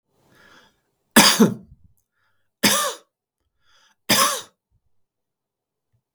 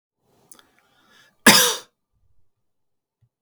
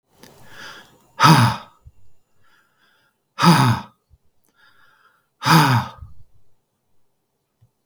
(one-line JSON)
{"three_cough_length": "6.1 s", "three_cough_amplitude": 32768, "three_cough_signal_mean_std_ratio": 0.29, "cough_length": "3.4 s", "cough_amplitude": 32768, "cough_signal_mean_std_ratio": 0.22, "exhalation_length": "7.9 s", "exhalation_amplitude": 32766, "exhalation_signal_mean_std_ratio": 0.33, "survey_phase": "beta (2021-08-13 to 2022-03-07)", "age": "45-64", "gender": "Male", "wearing_mask": "No", "symptom_none": true, "smoker_status": "Never smoked", "respiratory_condition_asthma": false, "respiratory_condition_other": false, "recruitment_source": "REACT", "submission_delay": "1 day", "covid_test_result": "Negative", "covid_test_method": "RT-qPCR", "influenza_a_test_result": "Negative", "influenza_b_test_result": "Negative"}